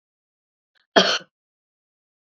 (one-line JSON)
{"cough_length": "2.4 s", "cough_amplitude": 27656, "cough_signal_mean_std_ratio": 0.22, "survey_phase": "beta (2021-08-13 to 2022-03-07)", "age": "45-64", "gender": "Female", "wearing_mask": "No", "symptom_none": true, "smoker_status": "Ex-smoker", "respiratory_condition_asthma": false, "respiratory_condition_other": false, "recruitment_source": "REACT", "submission_delay": "1 day", "covid_test_result": "Negative", "covid_test_method": "RT-qPCR"}